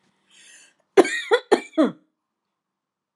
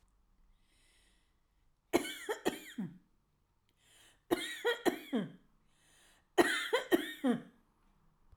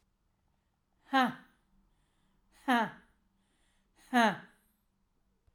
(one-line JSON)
{"cough_length": "3.2 s", "cough_amplitude": 31794, "cough_signal_mean_std_ratio": 0.28, "three_cough_length": "8.4 s", "three_cough_amplitude": 7884, "three_cough_signal_mean_std_ratio": 0.36, "exhalation_length": "5.5 s", "exhalation_amplitude": 6672, "exhalation_signal_mean_std_ratio": 0.27, "survey_phase": "alpha (2021-03-01 to 2021-08-12)", "age": "65+", "gender": "Female", "wearing_mask": "No", "symptom_none": true, "smoker_status": "Ex-smoker", "respiratory_condition_asthma": true, "respiratory_condition_other": false, "recruitment_source": "REACT", "submission_delay": "1 day", "covid_test_result": "Negative", "covid_test_method": "RT-qPCR"}